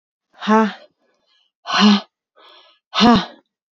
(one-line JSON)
{"exhalation_length": "3.8 s", "exhalation_amplitude": 28550, "exhalation_signal_mean_std_ratio": 0.39, "survey_phase": "beta (2021-08-13 to 2022-03-07)", "age": "18-44", "gender": "Female", "wearing_mask": "No", "symptom_cough_any": true, "symptom_runny_or_blocked_nose": true, "symptom_diarrhoea": true, "symptom_fatigue": true, "symptom_headache": true, "symptom_other": true, "symptom_onset": "2 days", "smoker_status": "Ex-smoker", "respiratory_condition_asthma": false, "respiratory_condition_other": false, "recruitment_source": "Test and Trace", "submission_delay": "1 day", "covid_test_result": "Positive", "covid_test_method": "RT-qPCR", "covid_ct_value": 19.1, "covid_ct_gene": "ORF1ab gene", "covid_ct_mean": 19.5, "covid_viral_load": "410000 copies/ml", "covid_viral_load_category": "Low viral load (10K-1M copies/ml)"}